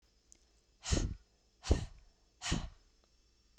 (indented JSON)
{
  "exhalation_length": "3.6 s",
  "exhalation_amplitude": 5771,
  "exhalation_signal_mean_std_ratio": 0.34,
  "survey_phase": "beta (2021-08-13 to 2022-03-07)",
  "age": "45-64",
  "gender": "Female",
  "wearing_mask": "No",
  "symptom_none": true,
  "smoker_status": "Never smoked",
  "respiratory_condition_asthma": false,
  "respiratory_condition_other": false,
  "recruitment_source": "REACT",
  "submission_delay": "-1 day",
  "covid_test_result": "Negative",
  "covid_test_method": "RT-qPCR"
}